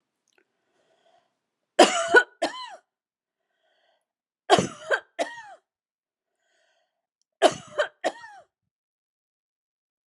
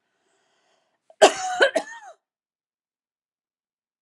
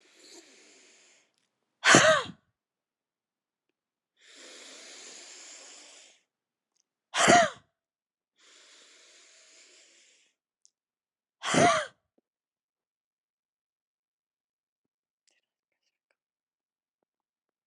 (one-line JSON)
{"three_cough_length": "10.1 s", "three_cough_amplitude": 32454, "three_cough_signal_mean_std_ratio": 0.23, "cough_length": "4.0 s", "cough_amplitude": 29229, "cough_signal_mean_std_ratio": 0.23, "exhalation_length": "17.7 s", "exhalation_amplitude": 25860, "exhalation_signal_mean_std_ratio": 0.21, "survey_phase": "beta (2021-08-13 to 2022-03-07)", "age": "45-64", "gender": "Female", "wearing_mask": "No", "symptom_none": true, "smoker_status": "Never smoked", "respiratory_condition_asthma": true, "respiratory_condition_other": false, "recruitment_source": "REACT", "submission_delay": "3 days", "covid_test_result": "Negative", "covid_test_method": "RT-qPCR", "influenza_a_test_result": "Negative", "influenza_b_test_result": "Negative"}